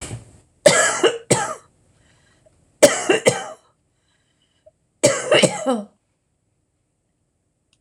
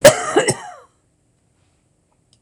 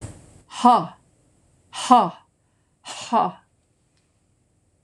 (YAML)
three_cough_length: 7.8 s
three_cough_amplitude: 26028
three_cough_signal_mean_std_ratio: 0.35
cough_length: 2.4 s
cough_amplitude: 26028
cough_signal_mean_std_ratio: 0.29
exhalation_length: 4.8 s
exhalation_amplitude: 26014
exhalation_signal_mean_std_ratio: 0.31
survey_phase: beta (2021-08-13 to 2022-03-07)
age: 65+
gender: Female
wearing_mask: 'No'
symptom_none: true
smoker_status: Never smoked
respiratory_condition_asthma: false
respiratory_condition_other: false
recruitment_source: REACT
submission_delay: 1 day
covid_test_result: Negative
covid_test_method: RT-qPCR
influenza_a_test_result: Negative
influenza_b_test_result: Negative